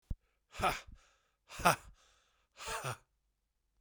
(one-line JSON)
{"exhalation_length": "3.8 s", "exhalation_amplitude": 9260, "exhalation_signal_mean_std_ratio": 0.3, "survey_phase": "beta (2021-08-13 to 2022-03-07)", "age": "45-64", "gender": "Male", "wearing_mask": "No", "symptom_cough_any": true, "symptom_new_continuous_cough": true, "symptom_sore_throat": true, "symptom_fatigue": true, "symptom_fever_high_temperature": true, "symptom_headache": true, "symptom_onset": "3 days", "smoker_status": "Never smoked", "respiratory_condition_asthma": false, "respiratory_condition_other": false, "recruitment_source": "Test and Trace", "submission_delay": "2 days", "covid_test_result": "Positive", "covid_test_method": "RT-qPCR", "covid_ct_value": 14.5, "covid_ct_gene": "S gene", "covid_ct_mean": 14.6, "covid_viral_load": "16000000 copies/ml", "covid_viral_load_category": "High viral load (>1M copies/ml)"}